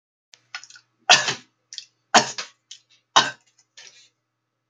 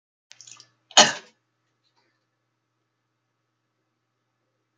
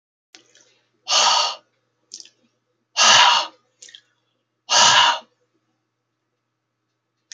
three_cough_length: 4.7 s
three_cough_amplitude: 32378
three_cough_signal_mean_std_ratio: 0.24
cough_length: 4.8 s
cough_amplitude: 32344
cough_signal_mean_std_ratio: 0.13
exhalation_length: 7.3 s
exhalation_amplitude: 30907
exhalation_signal_mean_std_ratio: 0.35
survey_phase: beta (2021-08-13 to 2022-03-07)
age: 65+
gender: Male
wearing_mask: 'No'
symptom_none: true
symptom_onset: 8 days
smoker_status: Ex-smoker
respiratory_condition_asthma: false
respiratory_condition_other: false
recruitment_source: REACT
submission_delay: 1 day
covid_test_result: Negative
covid_test_method: RT-qPCR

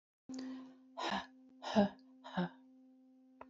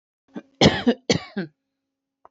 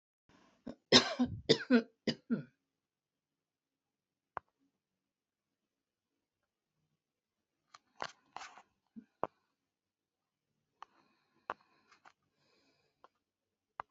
exhalation_length: 3.5 s
exhalation_amplitude: 4336
exhalation_signal_mean_std_ratio: 0.41
cough_length: 2.3 s
cough_amplitude: 26300
cough_signal_mean_std_ratio: 0.32
three_cough_length: 13.9 s
three_cough_amplitude: 12058
three_cough_signal_mean_std_ratio: 0.17
survey_phase: alpha (2021-03-01 to 2021-08-12)
age: 45-64
gender: Female
wearing_mask: 'No'
symptom_none: true
smoker_status: Never smoked
respiratory_condition_asthma: false
respiratory_condition_other: false
recruitment_source: REACT
submission_delay: 2 days
covid_test_result: Negative
covid_test_method: RT-qPCR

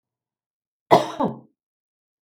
cough_length: 2.2 s
cough_amplitude: 32585
cough_signal_mean_std_ratio: 0.25
survey_phase: beta (2021-08-13 to 2022-03-07)
age: 65+
gender: Female
wearing_mask: 'No'
symptom_none: true
smoker_status: Never smoked
respiratory_condition_asthma: false
respiratory_condition_other: false
recruitment_source: REACT
submission_delay: 1 day
covid_test_result: Negative
covid_test_method: RT-qPCR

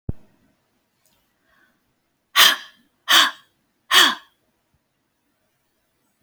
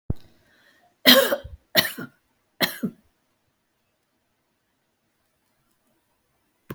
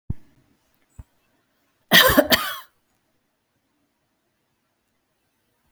exhalation_length: 6.2 s
exhalation_amplitude: 32768
exhalation_signal_mean_std_ratio: 0.26
three_cough_length: 6.7 s
three_cough_amplitude: 31781
three_cough_signal_mean_std_ratio: 0.23
cough_length: 5.7 s
cough_amplitude: 32768
cough_signal_mean_std_ratio: 0.23
survey_phase: beta (2021-08-13 to 2022-03-07)
age: 65+
gender: Female
wearing_mask: 'No'
symptom_none: true
smoker_status: Never smoked
respiratory_condition_asthma: true
respiratory_condition_other: false
recruitment_source: REACT
submission_delay: 1 day
covid_test_result: Negative
covid_test_method: RT-qPCR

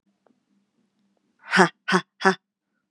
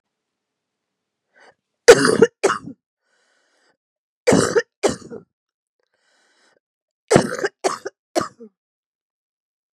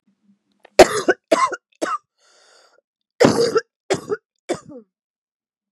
exhalation_length: 2.9 s
exhalation_amplitude: 32089
exhalation_signal_mean_std_ratio: 0.26
three_cough_length: 9.7 s
three_cough_amplitude: 32768
three_cough_signal_mean_std_ratio: 0.26
cough_length: 5.7 s
cough_amplitude: 32768
cough_signal_mean_std_ratio: 0.31
survey_phase: beta (2021-08-13 to 2022-03-07)
age: 18-44
gender: Female
wearing_mask: 'No'
symptom_new_continuous_cough: true
symptom_runny_or_blocked_nose: true
symptom_shortness_of_breath: true
symptom_sore_throat: true
symptom_change_to_sense_of_smell_or_taste: true
symptom_onset: 5 days
smoker_status: Never smoked
respiratory_condition_asthma: false
respiratory_condition_other: false
recruitment_source: Test and Trace
submission_delay: 2 days
covid_test_result: Positive
covid_test_method: RT-qPCR
covid_ct_value: 17.1
covid_ct_gene: ORF1ab gene
covid_ct_mean: 17.5
covid_viral_load: 1800000 copies/ml
covid_viral_load_category: High viral load (>1M copies/ml)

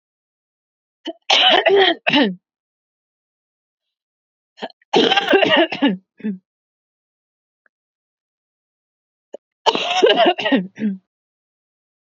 three_cough_length: 12.1 s
three_cough_amplitude: 31100
three_cough_signal_mean_std_ratio: 0.39
survey_phase: beta (2021-08-13 to 2022-03-07)
age: 18-44
gender: Female
wearing_mask: 'No'
symptom_cough_any: true
symptom_runny_or_blocked_nose: true
symptom_change_to_sense_of_smell_or_taste: true
symptom_onset: 4 days
smoker_status: Never smoked
respiratory_condition_asthma: true
respiratory_condition_other: false
recruitment_source: REACT
submission_delay: 4 days
covid_test_result: Positive
covid_test_method: RT-qPCR
covid_ct_value: 24.9
covid_ct_gene: N gene
influenza_a_test_result: Negative
influenza_b_test_result: Negative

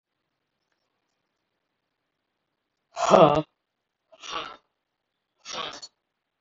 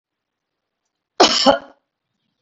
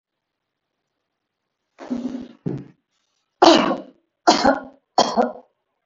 exhalation_length: 6.4 s
exhalation_amplitude: 24577
exhalation_signal_mean_std_ratio: 0.21
cough_length: 2.4 s
cough_amplitude: 32768
cough_signal_mean_std_ratio: 0.28
three_cough_length: 5.9 s
three_cough_amplitude: 32768
three_cough_signal_mean_std_ratio: 0.33
survey_phase: beta (2021-08-13 to 2022-03-07)
age: 45-64
gender: Female
wearing_mask: 'No'
symptom_none: true
smoker_status: Ex-smoker
respiratory_condition_asthma: false
respiratory_condition_other: false
recruitment_source: REACT
submission_delay: 4 days
covid_test_result: Negative
covid_test_method: RT-qPCR
influenza_a_test_result: Negative
influenza_b_test_result: Negative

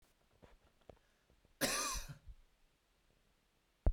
cough_length: 3.9 s
cough_amplitude: 3213
cough_signal_mean_std_ratio: 0.29
survey_phase: beta (2021-08-13 to 2022-03-07)
age: 18-44
gender: Male
wearing_mask: 'No'
symptom_none: true
smoker_status: Never smoked
respiratory_condition_asthma: false
respiratory_condition_other: false
recruitment_source: REACT
submission_delay: 2 days
covid_test_result: Negative
covid_test_method: RT-qPCR
influenza_a_test_result: Unknown/Void
influenza_b_test_result: Unknown/Void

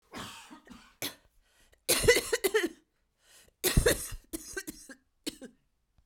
cough_length: 6.1 s
cough_amplitude: 11001
cough_signal_mean_std_ratio: 0.36
survey_phase: beta (2021-08-13 to 2022-03-07)
age: 45-64
gender: Female
wearing_mask: 'No'
symptom_cough_any: true
symptom_fatigue: true
smoker_status: Never smoked
respiratory_condition_asthma: false
respiratory_condition_other: false
recruitment_source: Test and Trace
submission_delay: 2 days
covid_test_result: Positive
covid_test_method: RT-qPCR
covid_ct_value: 31.4
covid_ct_gene: ORF1ab gene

